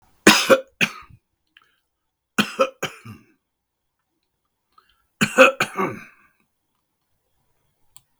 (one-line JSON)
{"three_cough_length": "8.2 s", "three_cough_amplitude": 32768, "three_cough_signal_mean_std_ratio": 0.25, "survey_phase": "beta (2021-08-13 to 2022-03-07)", "age": "65+", "gender": "Male", "wearing_mask": "No", "symptom_none": true, "smoker_status": "Ex-smoker", "respiratory_condition_asthma": false, "respiratory_condition_other": false, "recruitment_source": "REACT", "submission_delay": "2 days", "covid_test_result": "Negative", "covid_test_method": "RT-qPCR", "influenza_a_test_result": "Negative", "influenza_b_test_result": "Negative"}